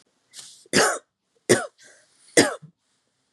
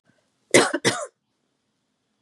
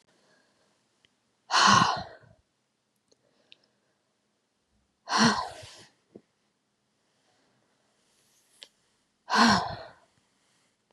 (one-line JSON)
{"three_cough_length": "3.3 s", "three_cough_amplitude": 28978, "three_cough_signal_mean_std_ratio": 0.3, "cough_length": "2.2 s", "cough_amplitude": 29059, "cough_signal_mean_std_ratio": 0.29, "exhalation_length": "10.9 s", "exhalation_amplitude": 15128, "exhalation_signal_mean_std_ratio": 0.27, "survey_phase": "beta (2021-08-13 to 2022-03-07)", "age": "45-64", "gender": "Female", "wearing_mask": "No", "symptom_runny_or_blocked_nose": true, "symptom_shortness_of_breath": true, "symptom_fatigue": true, "symptom_headache": true, "symptom_other": true, "symptom_onset": "9 days", "smoker_status": "Never smoked", "respiratory_condition_asthma": true, "respiratory_condition_other": false, "recruitment_source": "REACT", "submission_delay": "1 day", "covid_test_result": "Positive", "covid_test_method": "RT-qPCR", "covid_ct_value": 24.6, "covid_ct_gene": "E gene", "influenza_a_test_result": "Negative", "influenza_b_test_result": "Negative"}